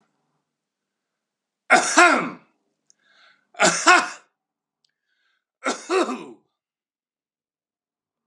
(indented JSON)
{
  "three_cough_length": "8.3 s",
  "three_cough_amplitude": 32140,
  "three_cough_signal_mean_std_ratio": 0.29,
  "survey_phase": "beta (2021-08-13 to 2022-03-07)",
  "age": "45-64",
  "gender": "Male",
  "wearing_mask": "No",
  "symptom_none": true,
  "smoker_status": "Current smoker (e-cigarettes or vapes only)",
  "respiratory_condition_asthma": false,
  "respiratory_condition_other": false,
  "recruitment_source": "REACT",
  "submission_delay": "2 days",
  "covid_test_result": "Negative",
  "covid_test_method": "RT-qPCR",
  "influenza_a_test_result": "Negative",
  "influenza_b_test_result": "Negative"
}